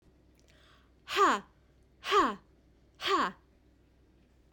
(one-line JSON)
{"exhalation_length": "4.5 s", "exhalation_amplitude": 6551, "exhalation_signal_mean_std_ratio": 0.36, "survey_phase": "beta (2021-08-13 to 2022-03-07)", "age": "45-64", "gender": "Female", "wearing_mask": "No", "symptom_none": true, "smoker_status": "Never smoked", "respiratory_condition_asthma": false, "respiratory_condition_other": false, "recruitment_source": "REACT", "submission_delay": "3 days", "covid_test_result": "Negative", "covid_test_method": "RT-qPCR"}